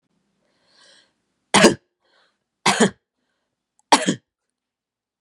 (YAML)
three_cough_length: 5.2 s
three_cough_amplitude: 32767
three_cough_signal_mean_std_ratio: 0.25
survey_phase: beta (2021-08-13 to 2022-03-07)
age: 18-44
gender: Female
wearing_mask: 'No'
symptom_none: true
smoker_status: Prefer not to say
respiratory_condition_asthma: false
respiratory_condition_other: false
recruitment_source: REACT
submission_delay: 0 days
covid_test_result: Negative
covid_test_method: RT-qPCR
influenza_a_test_result: Negative
influenza_b_test_result: Negative